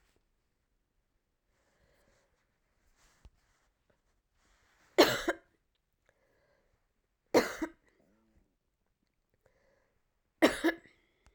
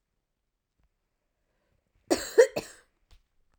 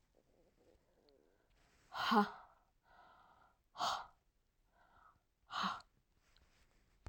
{
  "three_cough_length": "11.3 s",
  "three_cough_amplitude": 11514,
  "three_cough_signal_mean_std_ratio": 0.18,
  "cough_length": "3.6 s",
  "cough_amplitude": 16822,
  "cough_signal_mean_std_ratio": 0.19,
  "exhalation_length": "7.1 s",
  "exhalation_amplitude": 3054,
  "exhalation_signal_mean_std_ratio": 0.28,
  "survey_phase": "beta (2021-08-13 to 2022-03-07)",
  "age": "45-64",
  "gender": "Female",
  "wearing_mask": "No",
  "symptom_cough_any": true,
  "symptom_runny_or_blocked_nose": true,
  "symptom_fatigue": true,
  "symptom_onset": "2 days",
  "smoker_status": "Never smoked",
  "respiratory_condition_asthma": false,
  "respiratory_condition_other": false,
  "recruitment_source": "Test and Trace",
  "submission_delay": "1 day",
  "covid_test_result": "Positive",
  "covid_test_method": "RT-qPCR",
  "covid_ct_value": 16.6,
  "covid_ct_gene": "ORF1ab gene",
  "covid_ct_mean": 17.2,
  "covid_viral_load": "2200000 copies/ml",
  "covid_viral_load_category": "High viral load (>1M copies/ml)"
}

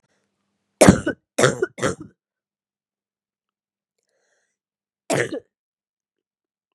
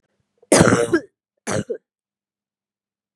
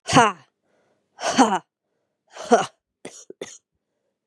{
  "three_cough_length": "6.7 s",
  "three_cough_amplitude": 32768,
  "three_cough_signal_mean_std_ratio": 0.22,
  "cough_length": "3.2 s",
  "cough_amplitude": 32768,
  "cough_signal_mean_std_ratio": 0.33,
  "exhalation_length": "4.3 s",
  "exhalation_amplitude": 32369,
  "exhalation_signal_mean_std_ratio": 0.3,
  "survey_phase": "beta (2021-08-13 to 2022-03-07)",
  "age": "45-64",
  "gender": "Female",
  "wearing_mask": "No",
  "symptom_cough_any": true,
  "symptom_runny_or_blocked_nose": true,
  "symptom_fatigue": true,
  "symptom_headache": true,
  "symptom_onset": "2 days",
  "smoker_status": "Never smoked",
  "respiratory_condition_asthma": false,
  "respiratory_condition_other": false,
  "recruitment_source": "Test and Trace",
  "submission_delay": "2 days",
  "covid_test_result": "Positive",
  "covid_test_method": "RT-qPCR",
  "covid_ct_value": 22.9,
  "covid_ct_gene": "ORF1ab gene",
  "covid_ct_mean": 22.9,
  "covid_viral_load": "31000 copies/ml",
  "covid_viral_load_category": "Low viral load (10K-1M copies/ml)"
}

